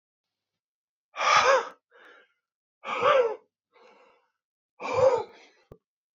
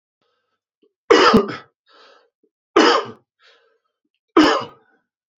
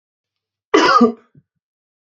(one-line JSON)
{"exhalation_length": "6.1 s", "exhalation_amplitude": 14273, "exhalation_signal_mean_std_ratio": 0.37, "three_cough_length": "5.4 s", "three_cough_amplitude": 32632, "three_cough_signal_mean_std_ratio": 0.33, "cough_length": "2.0 s", "cough_amplitude": 28249, "cough_signal_mean_std_ratio": 0.36, "survey_phase": "beta (2021-08-13 to 2022-03-07)", "age": "45-64", "gender": "Male", "wearing_mask": "No", "symptom_cough_any": true, "symptom_runny_or_blocked_nose": true, "symptom_fatigue": true, "symptom_headache": true, "smoker_status": "Never smoked", "respiratory_condition_asthma": false, "respiratory_condition_other": false, "recruitment_source": "Test and Trace", "submission_delay": "2 days", "covid_test_result": "Positive", "covid_test_method": "RT-qPCR", "covid_ct_value": 33.6, "covid_ct_gene": "ORF1ab gene"}